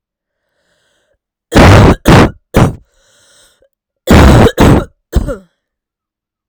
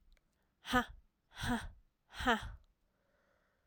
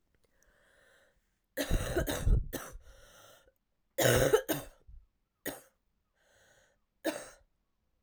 {"cough_length": "6.5 s", "cough_amplitude": 32768, "cough_signal_mean_std_ratio": 0.47, "exhalation_length": "3.7 s", "exhalation_amplitude": 4239, "exhalation_signal_mean_std_ratio": 0.35, "three_cough_length": "8.0 s", "three_cough_amplitude": 8654, "three_cough_signal_mean_std_ratio": 0.35, "survey_phase": "alpha (2021-03-01 to 2021-08-12)", "age": "18-44", "gender": "Female", "wearing_mask": "No", "symptom_cough_any": true, "symptom_fatigue": true, "symptom_headache": true, "smoker_status": "Ex-smoker", "respiratory_condition_asthma": false, "respiratory_condition_other": false, "recruitment_source": "Test and Trace", "submission_delay": "2 days", "covid_test_result": "Positive", "covid_test_method": "RT-qPCR", "covid_ct_value": 14.9, "covid_ct_gene": "N gene", "covid_ct_mean": 15.0, "covid_viral_load": "12000000 copies/ml", "covid_viral_load_category": "High viral load (>1M copies/ml)"}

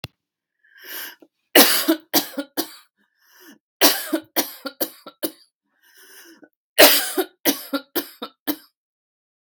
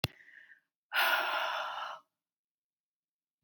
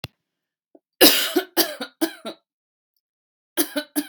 {"three_cough_length": "9.5 s", "three_cough_amplitude": 32768, "three_cough_signal_mean_std_ratio": 0.32, "exhalation_length": "3.4 s", "exhalation_amplitude": 8481, "exhalation_signal_mean_std_ratio": 0.44, "cough_length": "4.1 s", "cough_amplitude": 32767, "cough_signal_mean_std_ratio": 0.32, "survey_phase": "beta (2021-08-13 to 2022-03-07)", "age": "45-64", "gender": "Female", "wearing_mask": "No", "symptom_none": true, "smoker_status": "Never smoked", "respiratory_condition_asthma": false, "respiratory_condition_other": false, "recruitment_source": "REACT", "submission_delay": "5 days", "covid_test_result": "Negative", "covid_test_method": "RT-qPCR"}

